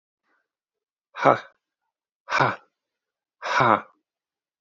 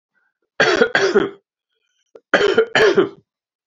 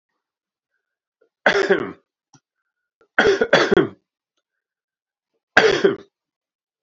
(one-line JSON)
{"exhalation_length": "4.6 s", "exhalation_amplitude": 26404, "exhalation_signal_mean_std_ratio": 0.28, "cough_length": "3.7 s", "cough_amplitude": 27777, "cough_signal_mean_std_ratio": 0.48, "three_cough_length": "6.8 s", "three_cough_amplitude": 29079, "three_cough_signal_mean_std_ratio": 0.33, "survey_phase": "beta (2021-08-13 to 2022-03-07)", "age": "18-44", "gender": "Male", "wearing_mask": "No", "symptom_cough_any": true, "symptom_runny_or_blocked_nose": true, "symptom_sore_throat": true, "symptom_fatigue": true, "symptom_fever_high_temperature": true, "symptom_headache": true, "smoker_status": "Never smoked", "respiratory_condition_asthma": false, "respiratory_condition_other": false, "recruitment_source": "Test and Trace", "submission_delay": "1 day", "covid_test_result": "Positive", "covid_test_method": "RT-qPCR", "covid_ct_value": 20.8, "covid_ct_gene": "N gene"}